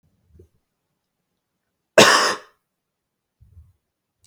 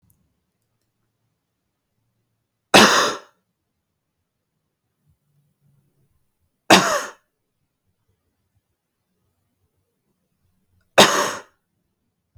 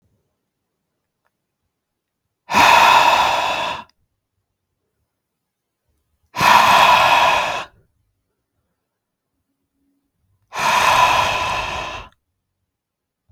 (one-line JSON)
{"cough_length": "4.3 s", "cough_amplitude": 32768, "cough_signal_mean_std_ratio": 0.22, "three_cough_length": "12.4 s", "three_cough_amplitude": 32768, "three_cough_signal_mean_std_ratio": 0.21, "exhalation_length": "13.3 s", "exhalation_amplitude": 32768, "exhalation_signal_mean_std_ratio": 0.43, "survey_phase": "beta (2021-08-13 to 2022-03-07)", "age": "18-44", "gender": "Male", "wearing_mask": "No", "symptom_none": true, "smoker_status": "Never smoked", "respiratory_condition_asthma": false, "respiratory_condition_other": false, "recruitment_source": "REACT", "submission_delay": "2 days", "covid_test_result": "Negative", "covid_test_method": "RT-qPCR", "influenza_a_test_result": "Negative", "influenza_b_test_result": "Negative"}